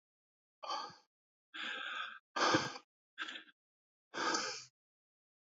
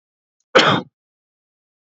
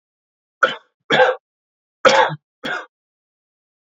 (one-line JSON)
{"exhalation_length": "5.5 s", "exhalation_amplitude": 4763, "exhalation_signal_mean_std_ratio": 0.42, "cough_length": "2.0 s", "cough_amplitude": 28842, "cough_signal_mean_std_ratio": 0.28, "three_cough_length": "3.8 s", "three_cough_amplitude": 27551, "three_cough_signal_mean_std_ratio": 0.33, "survey_phase": "alpha (2021-03-01 to 2021-08-12)", "age": "18-44", "gender": "Male", "wearing_mask": "No", "symptom_none": true, "smoker_status": "Never smoked", "respiratory_condition_asthma": false, "respiratory_condition_other": false, "recruitment_source": "REACT", "submission_delay": "1 day", "covid_test_result": "Negative", "covid_test_method": "RT-qPCR"}